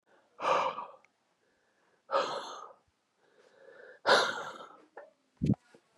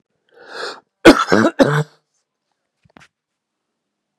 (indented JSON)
{
  "exhalation_length": "6.0 s",
  "exhalation_amplitude": 9199,
  "exhalation_signal_mean_std_ratio": 0.37,
  "cough_length": "4.2 s",
  "cough_amplitude": 32768,
  "cough_signal_mean_std_ratio": 0.28,
  "survey_phase": "beta (2021-08-13 to 2022-03-07)",
  "age": "18-44",
  "gender": "Male",
  "wearing_mask": "No",
  "symptom_cough_any": true,
  "symptom_shortness_of_breath": true,
  "symptom_sore_throat": true,
  "symptom_fatigue": true,
  "symptom_headache": true,
  "symptom_onset": "3 days",
  "smoker_status": "Never smoked",
  "respiratory_condition_asthma": false,
  "respiratory_condition_other": false,
  "recruitment_source": "Test and Trace",
  "submission_delay": "1 day",
  "covid_test_result": "Positive",
  "covid_test_method": "RT-qPCR",
  "covid_ct_value": 21.6,
  "covid_ct_gene": "ORF1ab gene"
}